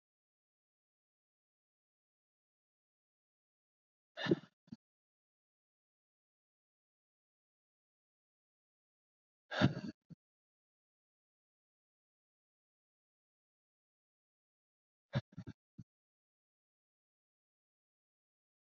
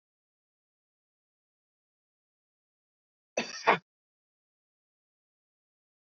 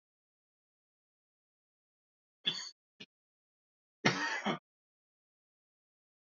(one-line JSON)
{"exhalation_length": "18.8 s", "exhalation_amplitude": 5210, "exhalation_signal_mean_std_ratio": 0.12, "cough_length": "6.1 s", "cough_amplitude": 14814, "cough_signal_mean_std_ratio": 0.13, "three_cough_length": "6.4 s", "three_cough_amplitude": 7898, "three_cough_signal_mean_std_ratio": 0.23, "survey_phase": "beta (2021-08-13 to 2022-03-07)", "age": "18-44", "gender": "Male", "wearing_mask": "No", "symptom_cough_any": true, "symptom_runny_or_blocked_nose": true, "symptom_shortness_of_breath": true, "symptom_abdominal_pain": true, "symptom_fatigue": true, "smoker_status": "Never smoked", "respiratory_condition_asthma": false, "respiratory_condition_other": false, "recruitment_source": "Test and Trace", "submission_delay": "1 day", "covid_test_result": "Negative", "covid_test_method": "RT-qPCR"}